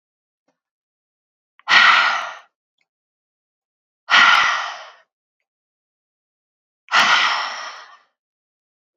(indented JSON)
{
  "exhalation_length": "9.0 s",
  "exhalation_amplitude": 30032,
  "exhalation_signal_mean_std_ratio": 0.35,
  "survey_phase": "beta (2021-08-13 to 2022-03-07)",
  "age": "45-64",
  "gender": "Female",
  "wearing_mask": "No",
  "symptom_cough_any": true,
  "symptom_runny_or_blocked_nose": true,
  "symptom_fatigue": true,
  "symptom_other": true,
  "symptom_onset": "5 days",
  "smoker_status": "Current smoker (e-cigarettes or vapes only)",
  "respiratory_condition_asthma": true,
  "respiratory_condition_other": false,
  "recruitment_source": "Test and Trace",
  "submission_delay": "1 day",
  "covid_test_result": "Positive",
  "covid_test_method": "RT-qPCR",
  "covid_ct_value": 21.1,
  "covid_ct_gene": "ORF1ab gene"
}